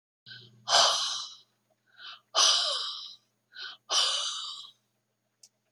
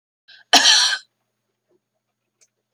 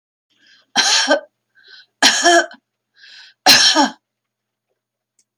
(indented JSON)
{
  "exhalation_length": "5.7 s",
  "exhalation_amplitude": 16185,
  "exhalation_signal_mean_std_ratio": 0.45,
  "cough_length": "2.7 s",
  "cough_amplitude": 31125,
  "cough_signal_mean_std_ratio": 0.31,
  "three_cough_length": "5.4 s",
  "three_cough_amplitude": 32768,
  "three_cough_signal_mean_std_ratio": 0.4,
  "survey_phase": "beta (2021-08-13 to 2022-03-07)",
  "age": "65+",
  "gender": "Female",
  "wearing_mask": "No",
  "symptom_shortness_of_breath": true,
  "symptom_fatigue": true,
  "smoker_status": "Never smoked",
  "respiratory_condition_asthma": false,
  "respiratory_condition_other": false,
  "recruitment_source": "REACT",
  "submission_delay": "1 day",
  "covid_test_result": "Negative",
  "covid_test_method": "RT-qPCR"
}